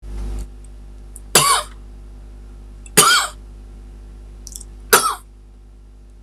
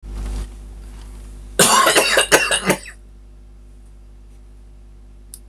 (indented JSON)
{
  "three_cough_length": "6.2 s",
  "three_cough_amplitude": 26028,
  "three_cough_signal_mean_std_ratio": 0.45,
  "cough_length": "5.5 s",
  "cough_amplitude": 26028,
  "cough_signal_mean_std_ratio": 0.49,
  "survey_phase": "beta (2021-08-13 to 2022-03-07)",
  "age": "18-44",
  "gender": "Male",
  "wearing_mask": "No",
  "symptom_none": true,
  "smoker_status": "Current smoker (1 to 10 cigarettes per day)",
  "respiratory_condition_asthma": false,
  "respiratory_condition_other": false,
  "recruitment_source": "REACT",
  "submission_delay": "1 day",
  "covid_test_result": "Negative",
  "covid_test_method": "RT-qPCR",
  "influenza_a_test_result": "Unknown/Void",
  "influenza_b_test_result": "Unknown/Void"
}